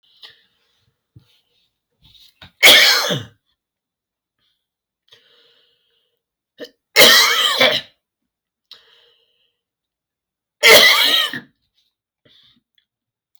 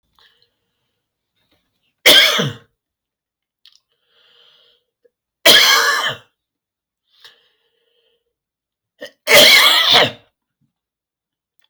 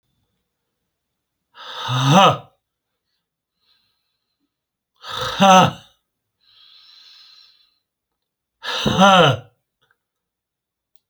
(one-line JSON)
{"three_cough_length": "13.4 s", "three_cough_amplitude": 32768, "three_cough_signal_mean_std_ratio": 0.31, "cough_length": "11.7 s", "cough_amplitude": 32768, "cough_signal_mean_std_ratio": 0.33, "exhalation_length": "11.1 s", "exhalation_amplitude": 29667, "exhalation_signal_mean_std_ratio": 0.31, "survey_phase": "alpha (2021-03-01 to 2021-08-12)", "age": "45-64", "gender": "Male", "wearing_mask": "No", "symptom_fatigue": true, "smoker_status": "Ex-smoker", "respiratory_condition_asthma": false, "respiratory_condition_other": true, "recruitment_source": "REACT", "submission_delay": "1 day", "covid_test_result": "Negative", "covid_test_method": "RT-qPCR"}